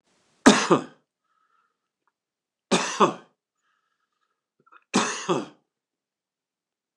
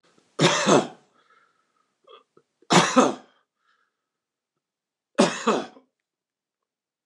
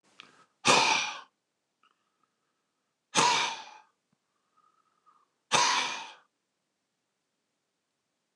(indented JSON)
{
  "cough_length": "7.0 s",
  "cough_amplitude": 29203,
  "cough_signal_mean_std_ratio": 0.26,
  "three_cough_length": "7.1 s",
  "three_cough_amplitude": 27104,
  "three_cough_signal_mean_std_ratio": 0.31,
  "exhalation_length": "8.4 s",
  "exhalation_amplitude": 13212,
  "exhalation_signal_mean_std_ratio": 0.32,
  "survey_phase": "beta (2021-08-13 to 2022-03-07)",
  "age": "65+",
  "gender": "Male",
  "wearing_mask": "No",
  "symptom_none": true,
  "smoker_status": "Ex-smoker",
  "respiratory_condition_asthma": false,
  "respiratory_condition_other": false,
  "recruitment_source": "REACT",
  "submission_delay": "1 day",
  "covid_test_result": "Negative",
  "covid_test_method": "RT-qPCR"
}